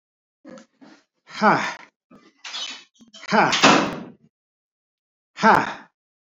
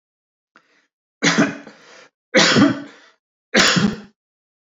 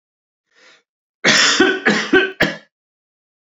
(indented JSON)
{
  "exhalation_length": "6.4 s",
  "exhalation_amplitude": 26947,
  "exhalation_signal_mean_std_ratio": 0.35,
  "three_cough_length": "4.6 s",
  "three_cough_amplitude": 29049,
  "three_cough_signal_mean_std_ratio": 0.41,
  "cough_length": "3.4 s",
  "cough_amplitude": 32237,
  "cough_signal_mean_std_ratio": 0.46,
  "survey_phase": "beta (2021-08-13 to 2022-03-07)",
  "age": "65+",
  "gender": "Male",
  "wearing_mask": "No",
  "symptom_cough_any": true,
  "smoker_status": "Never smoked",
  "respiratory_condition_asthma": false,
  "respiratory_condition_other": false,
  "recruitment_source": "REACT",
  "submission_delay": "3 days",
  "covid_test_result": "Negative",
  "covid_test_method": "RT-qPCR",
  "influenza_a_test_result": "Negative",
  "influenza_b_test_result": "Negative"
}